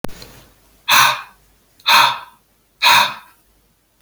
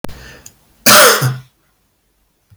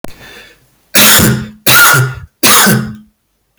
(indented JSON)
{
  "exhalation_length": "4.0 s",
  "exhalation_amplitude": 32074,
  "exhalation_signal_mean_std_ratio": 0.4,
  "cough_length": "2.6 s",
  "cough_amplitude": 32768,
  "cough_signal_mean_std_ratio": 0.39,
  "three_cough_length": "3.6 s",
  "three_cough_amplitude": 32768,
  "three_cough_signal_mean_std_ratio": 0.63,
  "survey_phase": "beta (2021-08-13 to 2022-03-07)",
  "age": "45-64",
  "gender": "Male",
  "wearing_mask": "No",
  "symptom_cough_any": true,
  "symptom_runny_or_blocked_nose": true,
  "symptom_sore_throat": true,
  "symptom_fatigue": true,
  "symptom_fever_high_temperature": true,
  "symptom_headache": true,
  "symptom_change_to_sense_of_smell_or_taste": true,
  "symptom_loss_of_taste": true,
  "symptom_onset": "4 days",
  "smoker_status": "Never smoked",
  "respiratory_condition_asthma": false,
  "respiratory_condition_other": false,
  "recruitment_source": "Test and Trace",
  "submission_delay": "3 days",
  "covid_test_result": "Positive",
  "covid_test_method": "RT-qPCR",
  "covid_ct_value": 21.6,
  "covid_ct_gene": "ORF1ab gene"
}